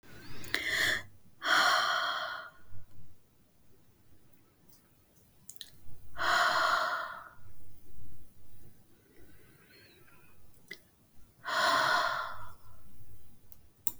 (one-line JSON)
{"exhalation_length": "14.0 s", "exhalation_amplitude": 17241, "exhalation_signal_mean_std_ratio": 0.66, "survey_phase": "beta (2021-08-13 to 2022-03-07)", "age": "65+", "gender": "Female", "wearing_mask": "No", "symptom_none": true, "smoker_status": "Ex-smoker", "respiratory_condition_asthma": false, "respiratory_condition_other": false, "recruitment_source": "REACT", "submission_delay": "1 day", "covid_test_result": "Negative", "covid_test_method": "RT-qPCR", "influenza_a_test_result": "Negative", "influenza_b_test_result": "Negative"}